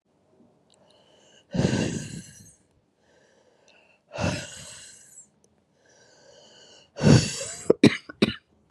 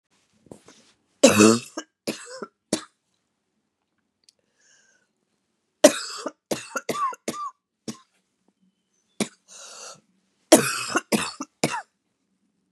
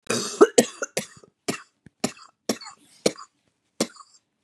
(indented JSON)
{
  "exhalation_length": "8.7 s",
  "exhalation_amplitude": 27213,
  "exhalation_signal_mean_std_ratio": 0.29,
  "three_cough_length": "12.7 s",
  "three_cough_amplitude": 32768,
  "three_cough_signal_mean_std_ratio": 0.26,
  "cough_length": "4.4 s",
  "cough_amplitude": 32195,
  "cough_signal_mean_std_ratio": 0.26,
  "survey_phase": "beta (2021-08-13 to 2022-03-07)",
  "age": "45-64",
  "gender": "Female",
  "wearing_mask": "No",
  "symptom_cough_any": true,
  "symptom_new_continuous_cough": true,
  "symptom_runny_or_blocked_nose": true,
  "symptom_shortness_of_breath": true,
  "symptom_sore_throat": true,
  "symptom_fatigue": true,
  "symptom_fever_high_temperature": true,
  "symptom_headache": true,
  "symptom_change_to_sense_of_smell_or_taste": true,
  "symptom_loss_of_taste": true,
  "smoker_status": "Never smoked",
  "respiratory_condition_asthma": false,
  "respiratory_condition_other": false,
  "recruitment_source": "Test and Trace",
  "submission_delay": "2 days",
  "covid_test_result": "Positive",
  "covid_test_method": "LFT"
}